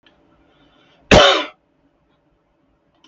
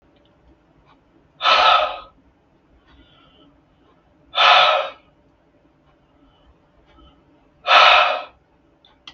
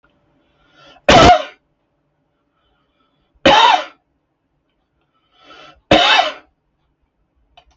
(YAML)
cough_length: 3.1 s
cough_amplitude: 32768
cough_signal_mean_std_ratio: 0.26
exhalation_length: 9.1 s
exhalation_amplitude: 32768
exhalation_signal_mean_std_ratio: 0.34
three_cough_length: 7.8 s
three_cough_amplitude: 32768
three_cough_signal_mean_std_ratio: 0.31
survey_phase: beta (2021-08-13 to 2022-03-07)
age: 45-64
gender: Male
wearing_mask: 'No'
symptom_none: true
smoker_status: Ex-smoker
respiratory_condition_asthma: false
respiratory_condition_other: false
recruitment_source: REACT
submission_delay: 9 days
covid_test_result: Negative
covid_test_method: RT-qPCR
influenza_a_test_result: Negative
influenza_b_test_result: Negative